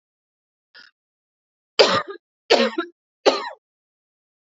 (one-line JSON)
{"three_cough_length": "4.4 s", "three_cough_amplitude": 30192, "three_cough_signal_mean_std_ratio": 0.29, "survey_phase": "alpha (2021-03-01 to 2021-08-12)", "age": "18-44", "gender": "Female", "wearing_mask": "No", "symptom_cough_any": true, "symptom_new_continuous_cough": true, "symptom_diarrhoea": true, "symptom_fatigue": true, "symptom_fever_high_temperature": true, "symptom_headache": true, "symptom_change_to_sense_of_smell_or_taste": true, "symptom_loss_of_taste": true, "symptom_onset": "4 days", "smoker_status": "Never smoked", "respiratory_condition_asthma": false, "respiratory_condition_other": false, "recruitment_source": "Test and Trace", "submission_delay": "2 days", "covid_test_result": "Positive", "covid_test_method": "RT-qPCR", "covid_ct_value": 21.4, "covid_ct_gene": "N gene", "covid_ct_mean": 21.5, "covid_viral_load": "91000 copies/ml", "covid_viral_load_category": "Low viral load (10K-1M copies/ml)"}